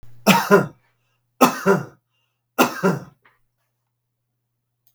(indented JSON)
{
  "three_cough_length": "4.9 s",
  "three_cough_amplitude": 32768,
  "three_cough_signal_mean_std_ratio": 0.34,
  "survey_phase": "beta (2021-08-13 to 2022-03-07)",
  "age": "65+",
  "gender": "Male",
  "wearing_mask": "No",
  "symptom_none": true,
  "smoker_status": "Ex-smoker",
  "respiratory_condition_asthma": false,
  "respiratory_condition_other": false,
  "recruitment_source": "REACT",
  "submission_delay": "5 days",
  "covid_test_result": "Negative",
  "covid_test_method": "RT-qPCR",
  "influenza_a_test_result": "Negative",
  "influenza_b_test_result": "Negative"
}